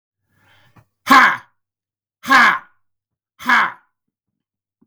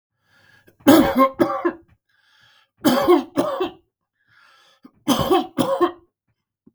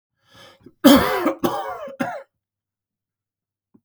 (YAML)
exhalation_length: 4.9 s
exhalation_amplitude: 32768
exhalation_signal_mean_std_ratio: 0.32
three_cough_length: 6.7 s
three_cough_amplitude: 32766
three_cough_signal_mean_std_ratio: 0.43
cough_length: 3.8 s
cough_amplitude: 32768
cough_signal_mean_std_ratio: 0.33
survey_phase: beta (2021-08-13 to 2022-03-07)
age: 45-64
gender: Male
wearing_mask: 'No'
symptom_none: true
smoker_status: Never smoked
respiratory_condition_asthma: false
respiratory_condition_other: false
recruitment_source: REACT
submission_delay: 21 days
covid_test_result: Negative
covid_test_method: RT-qPCR
influenza_a_test_result: Negative
influenza_b_test_result: Negative